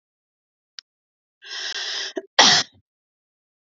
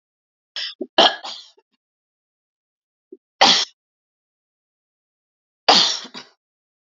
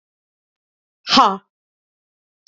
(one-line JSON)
{"cough_length": "3.7 s", "cough_amplitude": 29766, "cough_signal_mean_std_ratio": 0.29, "three_cough_length": "6.8 s", "three_cough_amplitude": 31239, "three_cough_signal_mean_std_ratio": 0.26, "exhalation_length": "2.5 s", "exhalation_amplitude": 28339, "exhalation_signal_mean_std_ratio": 0.24, "survey_phase": "beta (2021-08-13 to 2022-03-07)", "age": "45-64", "gender": "Female", "wearing_mask": "No", "symptom_none": true, "smoker_status": "Ex-smoker", "respiratory_condition_asthma": false, "respiratory_condition_other": false, "recruitment_source": "REACT", "submission_delay": "3 days", "covid_test_result": "Negative", "covid_test_method": "RT-qPCR", "influenza_a_test_result": "Unknown/Void", "influenza_b_test_result": "Unknown/Void"}